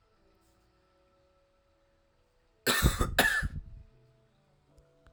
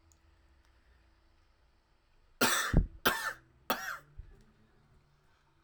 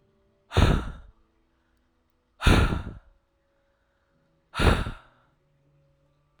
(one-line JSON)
{"cough_length": "5.1 s", "cough_amplitude": 12179, "cough_signal_mean_std_ratio": 0.32, "three_cough_length": "5.6 s", "three_cough_amplitude": 10328, "three_cough_signal_mean_std_ratio": 0.31, "exhalation_length": "6.4 s", "exhalation_amplitude": 19965, "exhalation_signal_mean_std_ratio": 0.32, "survey_phase": "alpha (2021-03-01 to 2021-08-12)", "age": "18-44", "gender": "Male", "wearing_mask": "No", "symptom_cough_any": true, "symptom_headache": true, "smoker_status": "Never smoked", "respiratory_condition_asthma": false, "respiratory_condition_other": false, "recruitment_source": "Test and Trace", "submission_delay": "2 days", "covid_test_result": "Positive", "covid_test_method": "RT-qPCR", "covid_ct_value": 27.1, "covid_ct_gene": "ORF1ab gene", "covid_ct_mean": 27.8, "covid_viral_load": "770 copies/ml", "covid_viral_load_category": "Minimal viral load (< 10K copies/ml)"}